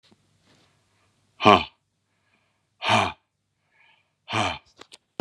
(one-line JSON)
{"exhalation_length": "5.2 s", "exhalation_amplitude": 32767, "exhalation_signal_mean_std_ratio": 0.25, "survey_phase": "beta (2021-08-13 to 2022-03-07)", "age": "45-64", "gender": "Male", "wearing_mask": "No", "symptom_cough_any": true, "symptom_new_continuous_cough": true, "symptom_runny_or_blocked_nose": true, "symptom_sore_throat": true, "symptom_fatigue": true, "symptom_headache": true, "symptom_onset": "2 days", "smoker_status": "Never smoked", "respiratory_condition_asthma": false, "respiratory_condition_other": false, "recruitment_source": "Test and Trace", "submission_delay": "1 day", "covid_test_result": "Positive", "covid_test_method": "RT-qPCR", "covid_ct_value": 25.1, "covid_ct_gene": "N gene"}